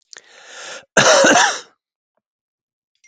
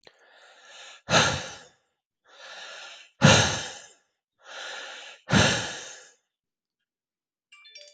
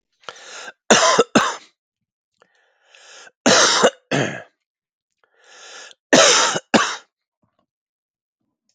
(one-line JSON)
{"cough_length": "3.1 s", "cough_amplitude": 32768, "cough_signal_mean_std_ratio": 0.39, "exhalation_length": "7.9 s", "exhalation_amplitude": 23828, "exhalation_signal_mean_std_ratio": 0.33, "three_cough_length": "8.7 s", "three_cough_amplitude": 32768, "three_cough_signal_mean_std_ratio": 0.37, "survey_phase": "beta (2021-08-13 to 2022-03-07)", "age": "45-64", "gender": "Male", "wearing_mask": "No", "symptom_cough_any": true, "symptom_runny_or_blocked_nose": true, "symptom_sore_throat": true, "symptom_headache": true, "symptom_onset": "3 days", "smoker_status": "Never smoked", "respiratory_condition_asthma": true, "respiratory_condition_other": false, "recruitment_source": "Test and Trace", "submission_delay": "2 days", "covid_test_result": "Positive", "covid_test_method": "ePCR"}